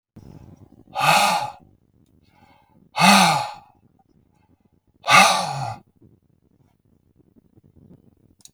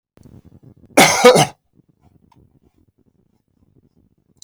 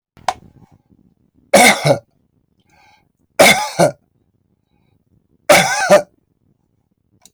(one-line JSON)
{"exhalation_length": "8.5 s", "exhalation_amplitude": 32383, "exhalation_signal_mean_std_ratio": 0.34, "cough_length": "4.4 s", "cough_amplitude": 32766, "cough_signal_mean_std_ratio": 0.26, "three_cough_length": "7.3 s", "three_cough_amplitude": 32768, "three_cough_signal_mean_std_ratio": 0.34, "survey_phase": "beta (2021-08-13 to 2022-03-07)", "age": "65+", "gender": "Male", "wearing_mask": "No", "symptom_none": true, "smoker_status": "Never smoked", "respiratory_condition_asthma": false, "respiratory_condition_other": false, "recruitment_source": "REACT", "submission_delay": "1 day", "covid_test_result": "Negative", "covid_test_method": "RT-qPCR", "influenza_a_test_result": "Negative", "influenza_b_test_result": "Negative"}